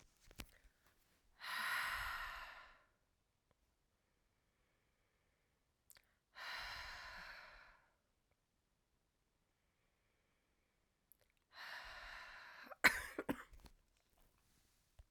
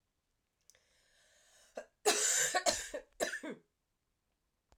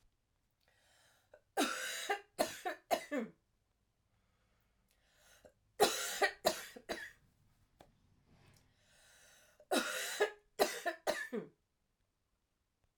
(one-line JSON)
{"exhalation_length": "15.1 s", "exhalation_amplitude": 5665, "exhalation_signal_mean_std_ratio": 0.3, "cough_length": "4.8 s", "cough_amplitude": 6253, "cough_signal_mean_std_ratio": 0.37, "three_cough_length": "13.0 s", "three_cough_amplitude": 5657, "three_cough_signal_mean_std_ratio": 0.36, "survey_phase": "alpha (2021-03-01 to 2021-08-12)", "age": "45-64", "gender": "Female", "wearing_mask": "No", "symptom_cough_any": true, "symptom_shortness_of_breath": true, "symptom_fatigue": true, "symptom_headache": true, "symptom_change_to_sense_of_smell_or_taste": true, "symptom_onset": "4 days", "smoker_status": "Never smoked", "respiratory_condition_asthma": false, "respiratory_condition_other": false, "recruitment_source": "Test and Trace", "submission_delay": "1 day", "covid_test_result": "Positive", "covid_test_method": "RT-qPCR", "covid_ct_value": 19.4, "covid_ct_gene": "ORF1ab gene"}